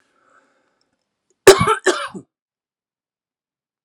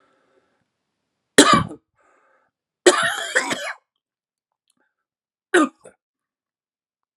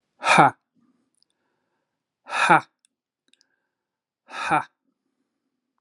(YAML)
cough_length: 3.8 s
cough_amplitude: 32768
cough_signal_mean_std_ratio: 0.22
three_cough_length: 7.2 s
three_cough_amplitude: 32768
three_cough_signal_mean_std_ratio: 0.27
exhalation_length: 5.8 s
exhalation_amplitude: 32357
exhalation_signal_mean_std_ratio: 0.25
survey_phase: alpha (2021-03-01 to 2021-08-12)
age: 45-64
gender: Male
wearing_mask: 'No'
symptom_cough_any: true
symptom_onset: 3 days
smoker_status: Never smoked
respiratory_condition_asthma: false
respiratory_condition_other: false
recruitment_source: Test and Trace
submission_delay: 1 day